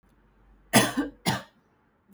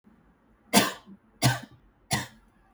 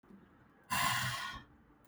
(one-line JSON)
{"cough_length": "2.1 s", "cough_amplitude": 19151, "cough_signal_mean_std_ratio": 0.34, "three_cough_length": "2.7 s", "three_cough_amplitude": 20149, "three_cough_signal_mean_std_ratio": 0.32, "exhalation_length": "1.9 s", "exhalation_amplitude": 3127, "exhalation_signal_mean_std_ratio": 0.54, "survey_phase": "beta (2021-08-13 to 2022-03-07)", "age": "18-44", "gender": "Female", "wearing_mask": "No", "symptom_none": true, "smoker_status": "Never smoked", "respiratory_condition_asthma": false, "respiratory_condition_other": false, "recruitment_source": "REACT", "submission_delay": "1 day", "covid_test_result": "Negative", "covid_test_method": "RT-qPCR"}